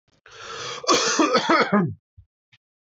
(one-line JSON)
{"cough_length": "2.8 s", "cough_amplitude": 19183, "cough_signal_mean_std_ratio": 0.55, "survey_phase": "alpha (2021-03-01 to 2021-08-12)", "age": "18-44", "gender": "Male", "wearing_mask": "No", "symptom_none": true, "smoker_status": "Never smoked", "respiratory_condition_asthma": false, "respiratory_condition_other": false, "recruitment_source": "REACT", "submission_delay": "2 days", "covid_test_result": "Negative", "covid_test_method": "RT-qPCR"}